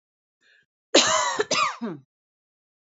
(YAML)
cough_length: 2.8 s
cough_amplitude: 25158
cough_signal_mean_std_ratio: 0.41
survey_phase: beta (2021-08-13 to 2022-03-07)
age: 45-64
gender: Female
wearing_mask: 'No'
symptom_none: true
smoker_status: Never smoked
respiratory_condition_asthma: false
respiratory_condition_other: false
recruitment_source: REACT
submission_delay: 1 day
covid_test_result: Negative
covid_test_method: RT-qPCR
influenza_a_test_result: Negative
influenza_b_test_result: Negative